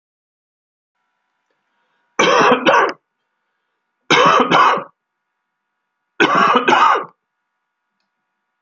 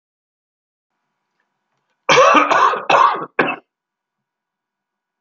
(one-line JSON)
{"three_cough_length": "8.6 s", "three_cough_amplitude": 32768, "three_cough_signal_mean_std_ratio": 0.42, "cough_length": "5.2 s", "cough_amplitude": 30901, "cough_signal_mean_std_ratio": 0.38, "survey_phase": "alpha (2021-03-01 to 2021-08-12)", "age": "65+", "gender": "Male", "wearing_mask": "No", "symptom_none": true, "smoker_status": "Ex-smoker", "respiratory_condition_asthma": false, "respiratory_condition_other": false, "recruitment_source": "REACT", "submission_delay": "2 days", "covid_test_result": "Negative", "covid_test_method": "RT-qPCR"}